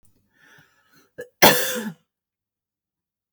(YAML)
cough_length: 3.3 s
cough_amplitude: 32768
cough_signal_mean_std_ratio: 0.24
survey_phase: beta (2021-08-13 to 2022-03-07)
age: 45-64
gender: Female
wearing_mask: 'No'
symptom_none: true
symptom_onset: 7 days
smoker_status: Never smoked
respiratory_condition_asthma: false
respiratory_condition_other: false
recruitment_source: REACT
submission_delay: 3 days
covid_test_result: Negative
covid_test_method: RT-qPCR
influenza_a_test_result: Negative
influenza_b_test_result: Negative